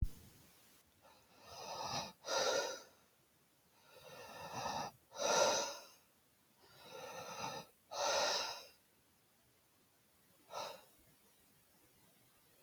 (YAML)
exhalation_length: 12.6 s
exhalation_amplitude: 3168
exhalation_signal_mean_std_ratio: 0.45
survey_phase: beta (2021-08-13 to 2022-03-07)
age: 18-44
gender: Male
wearing_mask: 'No'
symptom_none: true
smoker_status: Never smoked
respiratory_condition_asthma: false
respiratory_condition_other: false
recruitment_source: REACT
submission_delay: 2 days
covid_test_result: Negative
covid_test_method: RT-qPCR